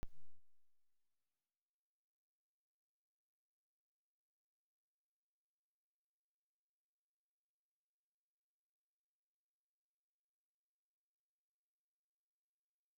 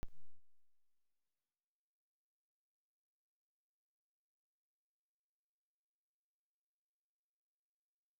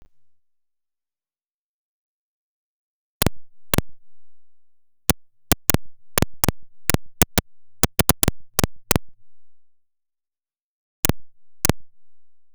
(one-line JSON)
{"three_cough_length": "13.0 s", "three_cough_amplitude": 581, "three_cough_signal_mean_std_ratio": 0.18, "cough_length": "8.2 s", "cough_amplitude": 704, "cough_signal_mean_std_ratio": 0.23, "exhalation_length": "12.5 s", "exhalation_amplitude": 32768, "exhalation_signal_mean_std_ratio": 0.36, "survey_phase": "beta (2021-08-13 to 2022-03-07)", "age": "65+", "gender": "Male", "wearing_mask": "No", "symptom_cough_any": true, "symptom_runny_or_blocked_nose": true, "symptom_sore_throat": true, "symptom_fatigue": true, "symptom_loss_of_taste": true, "symptom_other": true, "symptom_onset": "2 days", "smoker_status": "Never smoked", "respiratory_condition_asthma": true, "respiratory_condition_other": false, "recruitment_source": "Test and Trace", "submission_delay": "2 days", "covid_test_result": "Positive", "covid_test_method": "RT-qPCR", "covid_ct_value": 19.4, "covid_ct_gene": "ORF1ab gene"}